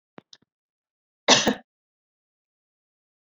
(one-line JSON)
{"cough_length": "3.2 s", "cough_amplitude": 27197, "cough_signal_mean_std_ratio": 0.2, "survey_phase": "beta (2021-08-13 to 2022-03-07)", "age": "45-64", "gender": "Female", "wearing_mask": "No", "symptom_cough_any": true, "symptom_runny_or_blocked_nose": true, "symptom_sore_throat": true, "symptom_fever_high_temperature": true, "symptom_headache": true, "symptom_change_to_sense_of_smell_or_taste": true, "symptom_onset": "2 days", "smoker_status": "Never smoked", "respiratory_condition_asthma": false, "respiratory_condition_other": false, "recruitment_source": "Test and Trace", "submission_delay": "0 days", "covid_test_result": "Positive", "covid_test_method": "RT-qPCR", "covid_ct_value": 21.5, "covid_ct_gene": "ORF1ab gene", "covid_ct_mean": 21.6, "covid_viral_load": "83000 copies/ml", "covid_viral_load_category": "Low viral load (10K-1M copies/ml)"}